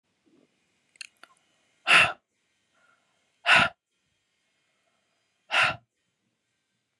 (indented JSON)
{
  "exhalation_length": "7.0 s",
  "exhalation_amplitude": 18806,
  "exhalation_signal_mean_std_ratio": 0.24,
  "survey_phase": "beta (2021-08-13 to 2022-03-07)",
  "age": "18-44",
  "gender": "Female",
  "wearing_mask": "No",
  "symptom_cough_any": true,
  "symptom_runny_or_blocked_nose": true,
  "symptom_sore_throat": true,
  "symptom_fatigue": true,
  "symptom_headache": true,
  "smoker_status": "Prefer not to say",
  "respiratory_condition_asthma": false,
  "respiratory_condition_other": false,
  "recruitment_source": "Test and Trace",
  "submission_delay": "2 days",
  "covid_test_result": "Positive",
  "covid_test_method": "RT-qPCR",
  "covid_ct_value": 29.3,
  "covid_ct_gene": "ORF1ab gene",
  "covid_ct_mean": 29.7,
  "covid_viral_load": "180 copies/ml",
  "covid_viral_load_category": "Minimal viral load (< 10K copies/ml)"
}